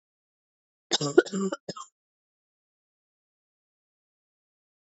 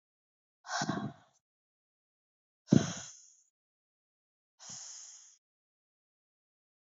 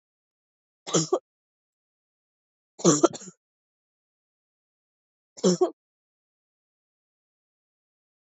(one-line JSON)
{"cough_length": "4.9 s", "cough_amplitude": 22793, "cough_signal_mean_std_ratio": 0.19, "exhalation_length": "6.9 s", "exhalation_amplitude": 11380, "exhalation_signal_mean_std_ratio": 0.2, "three_cough_length": "8.4 s", "three_cough_amplitude": 18002, "three_cough_signal_mean_std_ratio": 0.21, "survey_phase": "beta (2021-08-13 to 2022-03-07)", "age": "18-44", "gender": "Female", "wearing_mask": "No", "symptom_new_continuous_cough": true, "symptom_runny_or_blocked_nose": true, "symptom_sore_throat": true, "symptom_fatigue": true, "symptom_headache": true, "symptom_change_to_sense_of_smell_or_taste": true, "symptom_onset": "5 days", "smoker_status": "Never smoked", "respiratory_condition_asthma": false, "respiratory_condition_other": false, "recruitment_source": "Test and Trace", "submission_delay": "2 days", "covid_test_result": "Positive", "covid_test_method": "RT-qPCR", "covid_ct_value": 23.9, "covid_ct_gene": "N gene"}